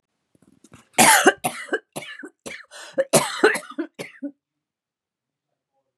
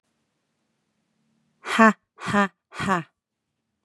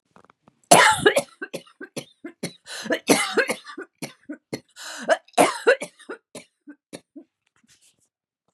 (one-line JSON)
{"cough_length": "6.0 s", "cough_amplitude": 32767, "cough_signal_mean_std_ratio": 0.33, "exhalation_length": "3.8 s", "exhalation_amplitude": 29919, "exhalation_signal_mean_std_ratio": 0.28, "three_cough_length": "8.5 s", "three_cough_amplitude": 32768, "three_cough_signal_mean_std_ratio": 0.33, "survey_phase": "beta (2021-08-13 to 2022-03-07)", "age": "45-64", "gender": "Female", "wearing_mask": "No", "symptom_runny_or_blocked_nose": true, "symptom_sore_throat": true, "symptom_headache": true, "symptom_onset": "6 days", "smoker_status": "Ex-smoker", "respiratory_condition_asthma": false, "respiratory_condition_other": false, "recruitment_source": "REACT", "submission_delay": "12 days", "covid_test_result": "Negative", "covid_test_method": "RT-qPCR"}